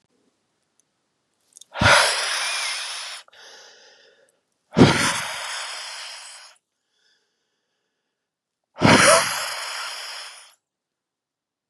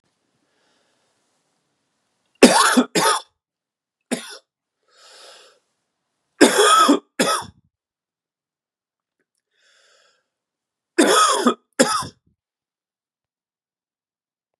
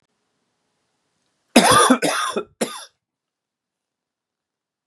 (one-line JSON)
{"exhalation_length": "11.7 s", "exhalation_amplitude": 31306, "exhalation_signal_mean_std_ratio": 0.37, "three_cough_length": "14.6 s", "three_cough_amplitude": 32768, "three_cough_signal_mean_std_ratio": 0.3, "cough_length": "4.9 s", "cough_amplitude": 32768, "cough_signal_mean_std_ratio": 0.31, "survey_phase": "beta (2021-08-13 to 2022-03-07)", "age": "45-64", "gender": "Male", "wearing_mask": "No", "symptom_cough_any": true, "symptom_sore_throat": true, "symptom_fever_high_temperature": true, "symptom_loss_of_taste": true, "smoker_status": "Never smoked", "respiratory_condition_asthma": false, "respiratory_condition_other": false, "recruitment_source": "Test and Trace", "submission_delay": "2 days", "covid_test_result": "Positive", "covid_test_method": "RT-qPCR"}